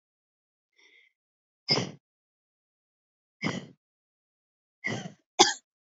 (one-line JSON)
{"exhalation_length": "6.0 s", "exhalation_amplitude": 32767, "exhalation_signal_mean_std_ratio": 0.22, "survey_phase": "alpha (2021-03-01 to 2021-08-12)", "age": "18-44", "gender": "Female", "wearing_mask": "No", "symptom_cough_any": true, "symptom_fatigue": true, "symptom_headache": true, "symptom_onset": "3 days", "smoker_status": "Never smoked", "respiratory_condition_asthma": false, "respiratory_condition_other": false, "recruitment_source": "Test and Trace", "submission_delay": "1 day", "covid_test_result": "Positive", "covid_test_method": "RT-qPCR"}